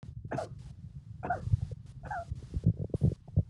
{"three_cough_length": "3.5 s", "three_cough_amplitude": 6205, "three_cough_signal_mean_std_ratio": 0.52, "survey_phase": "alpha (2021-03-01 to 2021-08-12)", "age": "65+", "gender": "Male", "wearing_mask": "No", "symptom_none": true, "smoker_status": "Never smoked", "respiratory_condition_asthma": false, "respiratory_condition_other": false, "recruitment_source": "REACT", "submission_delay": "2 days", "covid_test_result": "Negative", "covid_test_method": "RT-qPCR"}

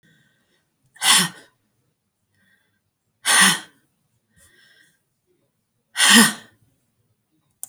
{"exhalation_length": "7.7 s", "exhalation_amplitude": 32767, "exhalation_signal_mean_std_ratio": 0.27, "survey_phase": "beta (2021-08-13 to 2022-03-07)", "age": "65+", "gender": "Female", "wearing_mask": "No", "symptom_none": true, "smoker_status": "Never smoked", "respiratory_condition_asthma": false, "respiratory_condition_other": false, "recruitment_source": "REACT", "submission_delay": "1 day", "covid_test_result": "Negative", "covid_test_method": "RT-qPCR"}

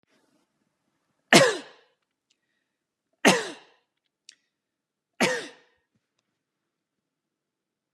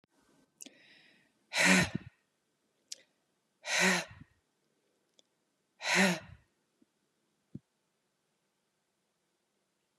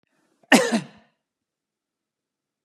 {"three_cough_length": "7.9 s", "three_cough_amplitude": 28340, "three_cough_signal_mean_std_ratio": 0.2, "exhalation_length": "10.0 s", "exhalation_amplitude": 10974, "exhalation_signal_mean_std_ratio": 0.27, "cough_length": "2.6 s", "cough_amplitude": 31488, "cough_signal_mean_std_ratio": 0.23, "survey_phase": "beta (2021-08-13 to 2022-03-07)", "age": "45-64", "gender": "Female", "wearing_mask": "No", "symptom_none": true, "smoker_status": "Never smoked", "respiratory_condition_asthma": false, "respiratory_condition_other": false, "recruitment_source": "REACT", "submission_delay": "2 days", "covid_test_result": "Negative", "covid_test_method": "RT-qPCR", "influenza_a_test_result": "Unknown/Void", "influenza_b_test_result": "Unknown/Void"}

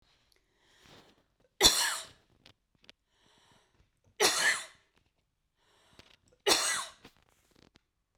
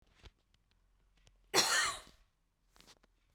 {"three_cough_length": "8.2 s", "three_cough_amplitude": 17389, "three_cough_signal_mean_std_ratio": 0.29, "cough_length": "3.3 s", "cough_amplitude": 6238, "cough_signal_mean_std_ratio": 0.3, "survey_phase": "beta (2021-08-13 to 2022-03-07)", "age": "45-64", "gender": "Female", "wearing_mask": "No", "symptom_none": true, "smoker_status": "Ex-smoker", "respiratory_condition_asthma": false, "respiratory_condition_other": false, "recruitment_source": "REACT", "submission_delay": "2 days", "covid_test_result": "Negative", "covid_test_method": "RT-qPCR", "influenza_a_test_result": "Unknown/Void", "influenza_b_test_result": "Unknown/Void"}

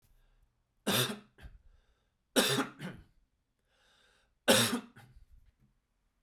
{"three_cough_length": "6.2 s", "three_cough_amplitude": 8651, "three_cough_signal_mean_std_ratio": 0.32, "survey_phase": "beta (2021-08-13 to 2022-03-07)", "age": "18-44", "gender": "Male", "wearing_mask": "No", "symptom_runny_or_blocked_nose": true, "symptom_sore_throat": true, "symptom_change_to_sense_of_smell_or_taste": true, "symptom_loss_of_taste": true, "symptom_onset": "6 days", "smoker_status": "Never smoked", "respiratory_condition_asthma": false, "respiratory_condition_other": false, "recruitment_source": "Test and Trace", "submission_delay": "2 days", "covid_test_result": "Positive", "covid_test_method": "RT-qPCR", "covid_ct_value": 17.7, "covid_ct_gene": "ORF1ab gene"}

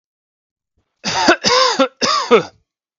{"cough_length": "3.0 s", "cough_amplitude": 32768, "cough_signal_mean_std_ratio": 0.49, "survey_phase": "beta (2021-08-13 to 2022-03-07)", "age": "18-44", "gender": "Male", "wearing_mask": "No", "symptom_cough_any": true, "symptom_runny_or_blocked_nose": true, "symptom_fatigue": true, "symptom_headache": true, "symptom_change_to_sense_of_smell_or_taste": true, "smoker_status": "Ex-smoker", "respiratory_condition_asthma": false, "respiratory_condition_other": false, "recruitment_source": "Test and Trace", "submission_delay": "1 day", "covid_test_result": "Positive", "covid_test_method": "RT-qPCR"}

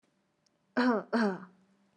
{"cough_length": "2.0 s", "cough_amplitude": 5791, "cough_signal_mean_std_ratio": 0.41, "survey_phase": "beta (2021-08-13 to 2022-03-07)", "age": "18-44", "gender": "Female", "wearing_mask": "Yes", "symptom_none": true, "symptom_onset": "4 days", "smoker_status": "Never smoked", "respiratory_condition_asthma": false, "respiratory_condition_other": false, "recruitment_source": "REACT", "submission_delay": "1 day", "covid_test_result": "Negative", "covid_test_method": "RT-qPCR", "influenza_a_test_result": "Unknown/Void", "influenza_b_test_result": "Unknown/Void"}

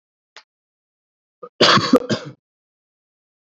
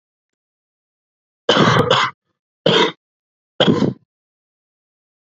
{"cough_length": "3.6 s", "cough_amplitude": 28648, "cough_signal_mean_std_ratio": 0.28, "three_cough_length": "5.3 s", "three_cough_amplitude": 32767, "three_cough_signal_mean_std_ratio": 0.37, "survey_phase": "beta (2021-08-13 to 2022-03-07)", "age": "18-44", "gender": "Male", "wearing_mask": "No", "symptom_cough_any": true, "symptom_runny_or_blocked_nose": true, "symptom_sore_throat": true, "smoker_status": "Never smoked", "respiratory_condition_asthma": false, "respiratory_condition_other": false, "recruitment_source": "Test and Trace", "submission_delay": "2 days", "covid_test_result": "Negative", "covid_test_method": "RT-qPCR"}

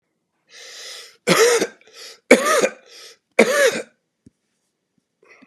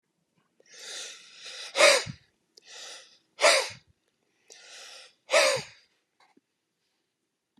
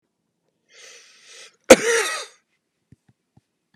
{"three_cough_length": "5.5 s", "three_cough_amplitude": 32768, "three_cough_signal_mean_std_ratio": 0.38, "exhalation_length": "7.6 s", "exhalation_amplitude": 19372, "exhalation_signal_mean_std_ratio": 0.3, "cough_length": "3.8 s", "cough_amplitude": 32768, "cough_signal_mean_std_ratio": 0.2, "survey_phase": "beta (2021-08-13 to 2022-03-07)", "age": "45-64", "gender": "Male", "wearing_mask": "No", "symptom_cough_any": true, "symptom_new_continuous_cough": true, "symptom_runny_or_blocked_nose": true, "symptom_sore_throat": true, "symptom_fatigue": true, "symptom_headache": true, "symptom_onset": "4 days", "smoker_status": "Never smoked", "respiratory_condition_asthma": true, "respiratory_condition_other": false, "recruitment_source": "Test and Trace", "submission_delay": "2 days", "covid_test_result": "Positive", "covid_test_method": "RT-qPCR", "covid_ct_value": 16.3, "covid_ct_gene": "N gene"}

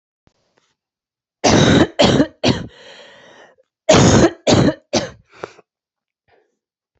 {"cough_length": "7.0 s", "cough_amplitude": 29130, "cough_signal_mean_std_ratio": 0.41, "survey_phase": "beta (2021-08-13 to 2022-03-07)", "age": "18-44", "gender": "Female", "wearing_mask": "No", "symptom_cough_any": true, "symptom_runny_or_blocked_nose": true, "symptom_shortness_of_breath": true, "symptom_fatigue": true, "symptom_fever_high_temperature": true, "symptom_headache": true, "symptom_change_to_sense_of_smell_or_taste": true, "symptom_loss_of_taste": true, "symptom_onset": "4 days", "smoker_status": "Never smoked", "respiratory_condition_asthma": false, "respiratory_condition_other": false, "recruitment_source": "Test and Trace", "submission_delay": "2 days", "covid_test_result": "Positive", "covid_test_method": "RT-qPCR", "covid_ct_value": 16.9, "covid_ct_gene": "ORF1ab gene", "covid_ct_mean": 17.9, "covid_viral_load": "1300000 copies/ml", "covid_viral_load_category": "High viral load (>1M copies/ml)"}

